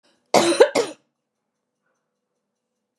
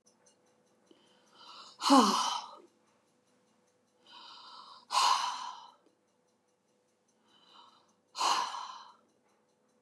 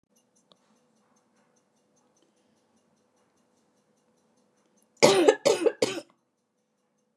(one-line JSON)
{"cough_length": "3.0 s", "cough_amplitude": 30864, "cough_signal_mean_std_ratio": 0.28, "exhalation_length": "9.8 s", "exhalation_amplitude": 10571, "exhalation_signal_mean_std_ratio": 0.31, "three_cough_length": "7.2 s", "three_cough_amplitude": 26944, "three_cough_signal_mean_std_ratio": 0.23, "survey_phase": "beta (2021-08-13 to 2022-03-07)", "age": "65+", "gender": "Female", "wearing_mask": "No", "symptom_none": true, "smoker_status": "Never smoked", "respiratory_condition_asthma": false, "respiratory_condition_other": false, "recruitment_source": "REACT", "submission_delay": "3 days", "covid_test_result": "Negative", "covid_test_method": "RT-qPCR", "influenza_a_test_result": "Negative", "influenza_b_test_result": "Negative"}